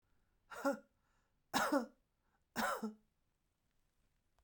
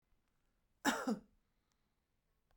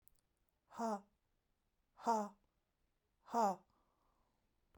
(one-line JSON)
{"three_cough_length": "4.4 s", "three_cough_amplitude": 3518, "three_cough_signal_mean_std_ratio": 0.34, "cough_length": "2.6 s", "cough_amplitude": 3026, "cough_signal_mean_std_ratio": 0.27, "exhalation_length": "4.8 s", "exhalation_amplitude": 2181, "exhalation_signal_mean_std_ratio": 0.3, "survey_phase": "beta (2021-08-13 to 2022-03-07)", "age": "45-64", "gender": "Female", "wearing_mask": "No", "symptom_fatigue": true, "smoker_status": "Never smoked", "respiratory_condition_asthma": false, "respiratory_condition_other": false, "recruitment_source": "Test and Trace", "submission_delay": "0 days", "covid_test_result": "Negative", "covid_test_method": "LFT"}